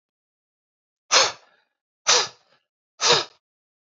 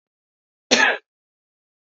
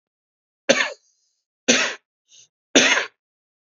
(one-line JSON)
{"exhalation_length": "3.8 s", "exhalation_amplitude": 23331, "exhalation_signal_mean_std_ratio": 0.31, "cough_length": "2.0 s", "cough_amplitude": 31242, "cough_signal_mean_std_ratio": 0.27, "three_cough_length": "3.8 s", "three_cough_amplitude": 32768, "three_cough_signal_mean_std_ratio": 0.32, "survey_phase": "beta (2021-08-13 to 2022-03-07)", "age": "18-44", "gender": "Male", "wearing_mask": "No", "symptom_fatigue": true, "symptom_onset": "13 days", "smoker_status": "Never smoked", "respiratory_condition_asthma": false, "respiratory_condition_other": false, "recruitment_source": "REACT", "submission_delay": "2 days", "covid_test_result": "Negative", "covid_test_method": "RT-qPCR", "influenza_a_test_result": "Negative", "influenza_b_test_result": "Negative"}